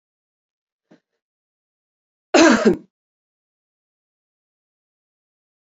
{"cough_length": "5.7 s", "cough_amplitude": 31096, "cough_signal_mean_std_ratio": 0.21, "survey_phase": "beta (2021-08-13 to 2022-03-07)", "age": "45-64", "gender": "Female", "wearing_mask": "Yes", "symptom_cough_any": true, "symptom_runny_or_blocked_nose": true, "symptom_sore_throat": true, "smoker_status": "Ex-smoker", "respiratory_condition_asthma": false, "respiratory_condition_other": false, "recruitment_source": "Test and Trace", "submission_delay": "2 days", "covid_test_result": "Positive", "covid_test_method": "LFT"}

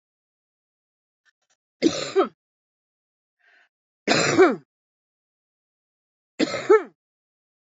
{"three_cough_length": "7.8 s", "three_cough_amplitude": 25547, "three_cough_signal_mean_std_ratio": 0.28, "survey_phase": "beta (2021-08-13 to 2022-03-07)", "age": "45-64", "gender": "Female", "wearing_mask": "No", "symptom_cough_any": true, "symptom_runny_or_blocked_nose": true, "symptom_shortness_of_breath": true, "symptom_fatigue": true, "symptom_other": true, "symptom_onset": "6 days", "smoker_status": "Ex-smoker", "respiratory_condition_asthma": false, "respiratory_condition_other": false, "recruitment_source": "Test and Trace", "submission_delay": "2 days", "covid_test_result": "Positive", "covid_test_method": "RT-qPCR", "covid_ct_value": 16.4, "covid_ct_gene": "ORF1ab gene", "covid_ct_mean": 16.6, "covid_viral_load": "3700000 copies/ml", "covid_viral_load_category": "High viral load (>1M copies/ml)"}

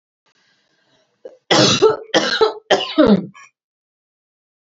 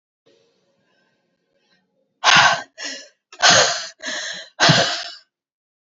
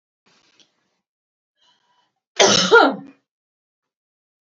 {"three_cough_length": "4.6 s", "three_cough_amplitude": 28035, "three_cough_signal_mean_std_ratio": 0.41, "exhalation_length": "5.8 s", "exhalation_amplitude": 32767, "exhalation_signal_mean_std_ratio": 0.39, "cough_length": "4.4 s", "cough_amplitude": 29368, "cough_signal_mean_std_ratio": 0.27, "survey_phase": "beta (2021-08-13 to 2022-03-07)", "age": "18-44", "gender": "Female", "wearing_mask": "No", "symptom_cough_any": true, "symptom_shortness_of_breath": true, "symptom_fatigue": true, "symptom_onset": "12 days", "smoker_status": "Prefer not to say", "respiratory_condition_asthma": true, "respiratory_condition_other": false, "recruitment_source": "REACT", "submission_delay": "1 day", "covid_test_result": "Negative", "covid_test_method": "RT-qPCR", "influenza_a_test_result": "Negative", "influenza_b_test_result": "Negative"}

